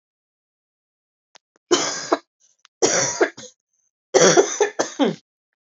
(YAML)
three_cough_length: 5.7 s
three_cough_amplitude: 30403
three_cough_signal_mean_std_ratio: 0.38
survey_phase: beta (2021-08-13 to 2022-03-07)
age: 18-44
gender: Female
wearing_mask: 'No'
symptom_cough_any: true
symptom_runny_or_blocked_nose: true
symptom_sore_throat: true
symptom_fatigue: true
symptom_headache: true
smoker_status: Ex-smoker
respiratory_condition_asthma: false
respiratory_condition_other: false
recruitment_source: Test and Trace
submission_delay: 2 days
covid_test_result: Positive
covid_test_method: RT-qPCR
covid_ct_value: 19.5
covid_ct_gene: ORF1ab gene
covid_ct_mean: 19.7
covid_viral_load: 340000 copies/ml
covid_viral_load_category: Low viral load (10K-1M copies/ml)